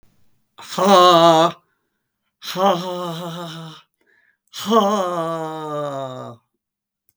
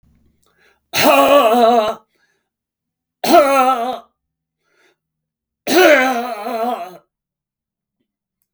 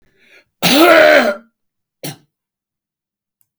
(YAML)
exhalation_length: 7.2 s
exhalation_amplitude: 32767
exhalation_signal_mean_std_ratio: 0.48
three_cough_length: 8.5 s
three_cough_amplitude: 32768
three_cough_signal_mean_std_ratio: 0.46
cough_length: 3.6 s
cough_amplitude: 32768
cough_signal_mean_std_ratio: 0.39
survey_phase: beta (2021-08-13 to 2022-03-07)
age: 65+
gender: Male
wearing_mask: 'No'
symptom_none: true
smoker_status: Never smoked
respiratory_condition_asthma: false
respiratory_condition_other: false
recruitment_source: REACT
submission_delay: 0 days
covid_test_result: Negative
covid_test_method: RT-qPCR
influenza_a_test_result: Negative
influenza_b_test_result: Negative